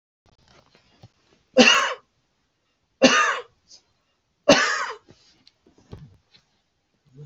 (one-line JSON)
{"three_cough_length": "7.3 s", "three_cough_amplitude": 31624, "three_cough_signal_mean_std_ratio": 0.3, "survey_phase": "beta (2021-08-13 to 2022-03-07)", "age": "65+", "gender": "Male", "wearing_mask": "No", "symptom_none": true, "symptom_onset": "4 days", "smoker_status": "Ex-smoker", "respiratory_condition_asthma": false, "respiratory_condition_other": false, "recruitment_source": "REACT", "submission_delay": "5 days", "covid_test_result": "Negative", "covid_test_method": "RT-qPCR", "influenza_a_test_result": "Negative", "influenza_b_test_result": "Negative"}